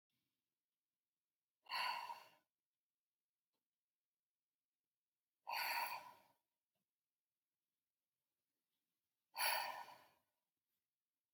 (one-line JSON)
{"exhalation_length": "11.3 s", "exhalation_amplitude": 1696, "exhalation_signal_mean_std_ratio": 0.29, "survey_phase": "beta (2021-08-13 to 2022-03-07)", "age": "18-44", "gender": "Female", "wearing_mask": "No", "symptom_cough_any": true, "symptom_runny_or_blocked_nose": true, "symptom_onset": "3 days", "smoker_status": "Ex-smoker", "respiratory_condition_asthma": true, "respiratory_condition_other": false, "recruitment_source": "Test and Trace", "submission_delay": "2 days", "covid_test_result": "Positive", "covid_test_method": "RT-qPCR", "covid_ct_value": 30.7, "covid_ct_gene": "ORF1ab gene"}